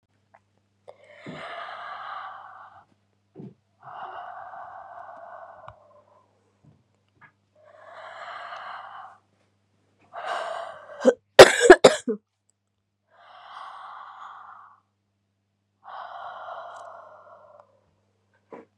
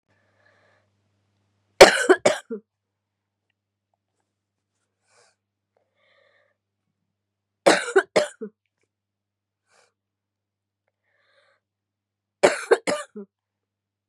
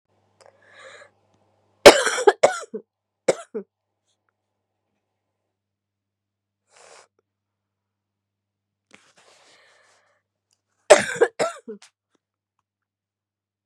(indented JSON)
{
  "exhalation_length": "18.8 s",
  "exhalation_amplitude": 32768,
  "exhalation_signal_mean_std_ratio": 0.18,
  "three_cough_length": "14.1 s",
  "three_cough_amplitude": 32768,
  "three_cough_signal_mean_std_ratio": 0.19,
  "cough_length": "13.7 s",
  "cough_amplitude": 32768,
  "cough_signal_mean_std_ratio": 0.17,
  "survey_phase": "beta (2021-08-13 to 2022-03-07)",
  "age": "18-44",
  "gender": "Female",
  "wearing_mask": "No",
  "symptom_cough_any": true,
  "symptom_runny_or_blocked_nose": true,
  "symptom_sore_throat": true,
  "symptom_fever_high_temperature": true,
  "symptom_onset": "3 days",
  "smoker_status": "Never smoked",
  "respiratory_condition_asthma": false,
  "respiratory_condition_other": false,
  "recruitment_source": "Test and Trace",
  "submission_delay": "3 days",
  "covid_test_result": "Positive",
  "covid_test_method": "RT-qPCR",
  "covid_ct_value": 28.9,
  "covid_ct_gene": "N gene"
}